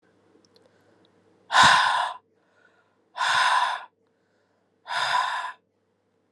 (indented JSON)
{
  "exhalation_length": "6.3 s",
  "exhalation_amplitude": 21956,
  "exhalation_signal_mean_std_ratio": 0.41,
  "survey_phase": "alpha (2021-03-01 to 2021-08-12)",
  "age": "18-44",
  "gender": "Female",
  "wearing_mask": "No",
  "symptom_cough_any": true,
  "symptom_shortness_of_breath": true,
  "symptom_fatigue": true,
  "symptom_headache": true,
  "symptom_change_to_sense_of_smell_or_taste": true,
  "symptom_onset": "3 days",
  "smoker_status": "Current smoker (1 to 10 cigarettes per day)",
  "respiratory_condition_asthma": false,
  "respiratory_condition_other": false,
  "recruitment_source": "Test and Trace",
  "submission_delay": "2 days",
  "covid_test_result": "Positive",
  "covid_test_method": "RT-qPCR",
  "covid_ct_value": 25.5,
  "covid_ct_gene": "N gene"
}